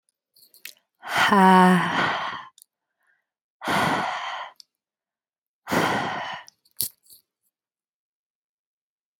{"exhalation_length": "9.2 s", "exhalation_amplitude": 32768, "exhalation_signal_mean_std_ratio": 0.38, "survey_phase": "beta (2021-08-13 to 2022-03-07)", "age": "45-64", "gender": "Female", "wearing_mask": "No", "symptom_none": true, "smoker_status": "Never smoked", "respiratory_condition_asthma": false, "respiratory_condition_other": false, "recruitment_source": "REACT", "submission_delay": "2 days", "covid_test_result": "Negative", "covid_test_method": "RT-qPCR"}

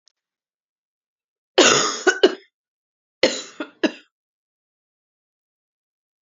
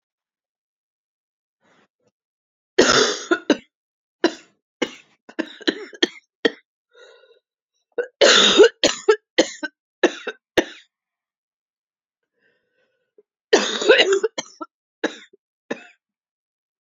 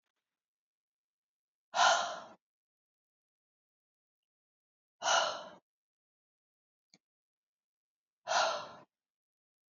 {"cough_length": "6.2 s", "cough_amplitude": 32549, "cough_signal_mean_std_ratio": 0.26, "three_cough_length": "16.8 s", "three_cough_amplitude": 32558, "three_cough_signal_mean_std_ratio": 0.29, "exhalation_length": "9.7 s", "exhalation_amplitude": 6625, "exhalation_signal_mean_std_ratio": 0.26, "survey_phase": "beta (2021-08-13 to 2022-03-07)", "age": "45-64", "gender": "Female", "wearing_mask": "No", "symptom_cough_any": true, "symptom_runny_or_blocked_nose": true, "symptom_shortness_of_breath": true, "symptom_sore_throat": true, "symptom_fatigue": true, "symptom_fever_high_temperature": true, "symptom_change_to_sense_of_smell_or_taste": true, "symptom_onset": "4 days", "smoker_status": "Never smoked", "respiratory_condition_asthma": false, "respiratory_condition_other": false, "recruitment_source": "Test and Trace", "submission_delay": "1 day", "covid_test_result": "Positive", "covid_test_method": "RT-qPCR", "covid_ct_value": 27.3, "covid_ct_gene": "ORF1ab gene", "covid_ct_mean": 27.8, "covid_viral_load": "790 copies/ml", "covid_viral_load_category": "Minimal viral load (< 10K copies/ml)"}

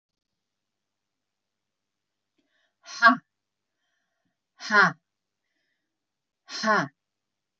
{"exhalation_length": "7.6 s", "exhalation_amplitude": 23370, "exhalation_signal_mean_std_ratio": 0.21, "survey_phase": "beta (2021-08-13 to 2022-03-07)", "age": "65+", "gender": "Female", "wearing_mask": "No", "symptom_none": true, "smoker_status": "Ex-smoker", "respiratory_condition_asthma": false, "respiratory_condition_other": false, "recruitment_source": "REACT", "submission_delay": "1 day", "covid_test_result": "Negative", "covid_test_method": "RT-qPCR"}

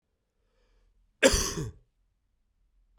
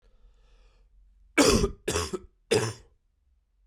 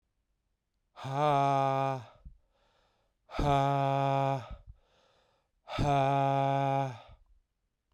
{"cough_length": "3.0 s", "cough_amplitude": 17654, "cough_signal_mean_std_ratio": 0.26, "three_cough_length": "3.7 s", "three_cough_amplitude": 15319, "three_cough_signal_mean_std_ratio": 0.37, "exhalation_length": "7.9 s", "exhalation_amplitude": 5792, "exhalation_signal_mean_std_ratio": 0.58, "survey_phase": "beta (2021-08-13 to 2022-03-07)", "age": "18-44", "gender": "Male", "wearing_mask": "No", "symptom_new_continuous_cough": true, "symptom_runny_or_blocked_nose": true, "symptom_fatigue": true, "symptom_headache": true, "symptom_change_to_sense_of_smell_or_taste": true, "symptom_loss_of_taste": true, "symptom_onset": "9 days", "smoker_status": "Never smoked", "respiratory_condition_asthma": false, "respiratory_condition_other": false, "recruitment_source": "Test and Trace", "submission_delay": "2 days", "covid_test_result": "Positive", "covid_test_method": "RT-qPCR", "covid_ct_value": 22.2, "covid_ct_gene": "ORF1ab gene"}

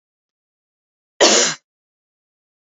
{"cough_length": "2.7 s", "cough_amplitude": 29231, "cough_signal_mean_std_ratio": 0.27, "survey_phase": "alpha (2021-03-01 to 2021-08-12)", "age": "18-44", "gender": "Female", "wearing_mask": "No", "symptom_none": true, "smoker_status": "Never smoked", "respiratory_condition_asthma": false, "respiratory_condition_other": false, "recruitment_source": "REACT", "submission_delay": "2 days", "covid_test_result": "Negative", "covid_test_method": "RT-qPCR"}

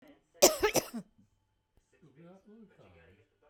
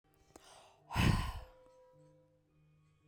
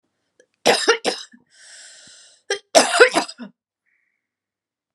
{"cough_length": "3.5 s", "cough_amplitude": 15064, "cough_signal_mean_std_ratio": 0.24, "exhalation_length": "3.1 s", "exhalation_amplitude": 4361, "exhalation_signal_mean_std_ratio": 0.32, "three_cough_length": "4.9 s", "three_cough_amplitude": 32768, "three_cough_signal_mean_std_ratio": 0.31, "survey_phase": "beta (2021-08-13 to 2022-03-07)", "age": "45-64", "gender": "Female", "wearing_mask": "No", "symptom_none": true, "smoker_status": "Never smoked", "respiratory_condition_asthma": false, "respiratory_condition_other": false, "recruitment_source": "REACT", "submission_delay": "4 days", "covid_test_result": "Negative", "covid_test_method": "RT-qPCR"}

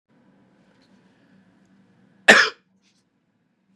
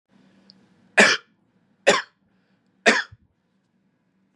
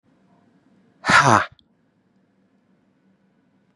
{"cough_length": "3.8 s", "cough_amplitude": 32768, "cough_signal_mean_std_ratio": 0.18, "three_cough_length": "4.4 s", "three_cough_amplitude": 30497, "three_cough_signal_mean_std_ratio": 0.26, "exhalation_length": "3.8 s", "exhalation_amplitude": 31945, "exhalation_signal_mean_std_ratio": 0.24, "survey_phase": "beta (2021-08-13 to 2022-03-07)", "age": "18-44", "gender": "Male", "wearing_mask": "No", "symptom_sore_throat": true, "symptom_fatigue": true, "symptom_onset": "12 days", "smoker_status": "Never smoked", "respiratory_condition_asthma": false, "respiratory_condition_other": false, "recruitment_source": "REACT", "submission_delay": "1 day", "covid_test_result": "Negative", "covid_test_method": "RT-qPCR", "influenza_a_test_result": "Negative", "influenza_b_test_result": "Negative"}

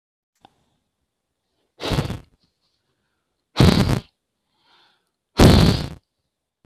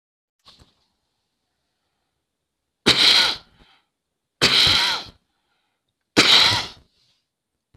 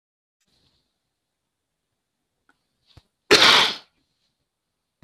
{"exhalation_length": "6.7 s", "exhalation_amplitude": 32768, "exhalation_signal_mean_std_ratio": 0.3, "three_cough_length": "7.8 s", "three_cough_amplitude": 28505, "three_cough_signal_mean_std_ratio": 0.35, "cough_length": "5.0 s", "cough_amplitude": 27966, "cough_signal_mean_std_ratio": 0.22, "survey_phase": "alpha (2021-03-01 to 2021-08-12)", "age": "45-64", "gender": "Female", "wearing_mask": "No", "symptom_none": true, "smoker_status": "Never smoked", "respiratory_condition_asthma": false, "respiratory_condition_other": false, "recruitment_source": "REACT", "submission_delay": "1 day", "covid_test_result": "Negative", "covid_test_method": "RT-qPCR"}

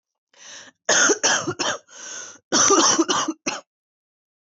{"cough_length": "4.4 s", "cough_amplitude": 18868, "cough_signal_mean_std_ratio": 0.52, "survey_phase": "beta (2021-08-13 to 2022-03-07)", "age": "18-44", "gender": "Female", "wearing_mask": "No", "symptom_cough_any": true, "symptom_runny_or_blocked_nose": true, "symptom_sore_throat": true, "symptom_change_to_sense_of_smell_or_taste": true, "symptom_onset": "4 days", "smoker_status": "Never smoked", "respiratory_condition_asthma": true, "respiratory_condition_other": false, "recruitment_source": "REACT", "submission_delay": "1 day", "covid_test_result": "Negative", "covid_test_method": "RT-qPCR", "influenza_a_test_result": "Negative", "influenza_b_test_result": "Negative"}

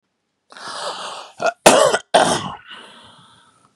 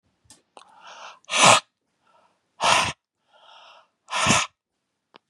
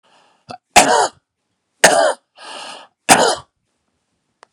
{"cough_length": "3.8 s", "cough_amplitude": 32768, "cough_signal_mean_std_ratio": 0.39, "exhalation_length": "5.3 s", "exhalation_amplitude": 28057, "exhalation_signal_mean_std_ratio": 0.32, "three_cough_length": "4.5 s", "three_cough_amplitude": 32768, "three_cough_signal_mean_std_ratio": 0.36, "survey_phase": "beta (2021-08-13 to 2022-03-07)", "age": "45-64", "gender": "Male", "wearing_mask": "No", "symptom_none": true, "smoker_status": "Prefer not to say", "respiratory_condition_asthma": false, "respiratory_condition_other": false, "recruitment_source": "REACT", "submission_delay": "1 day", "covid_test_result": "Negative", "covid_test_method": "RT-qPCR", "influenza_a_test_result": "Negative", "influenza_b_test_result": "Negative"}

